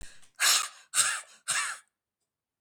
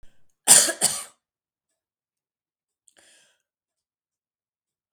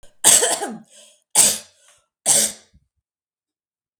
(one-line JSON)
{"exhalation_length": "2.6 s", "exhalation_amplitude": 14950, "exhalation_signal_mean_std_ratio": 0.45, "cough_length": "4.9 s", "cough_amplitude": 32768, "cough_signal_mean_std_ratio": 0.2, "three_cough_length": "4.0 s", "three_cough_amplitude": 32768, "three_cough_signal_mean_std_ratio": 0.36, "survey_phase": "beta (2021-08-13 to 2022-03-07)", "age": "45-64", "gender": "Female", "wearing_mask": "No", "symptom_none": true, "smoker_status": "Never smoked", "respiratory_condition_asthma": true, "respiratory_condition_other": false, "recruitment_source": "REACT", "submission_delay": "6 days", "covid_test_result": "Negative", "covid_test_method": "RT-qPCR", "influenza_a_test_result": "Unknown/Void", "influenza_b_test_result": "Unknown/Void"}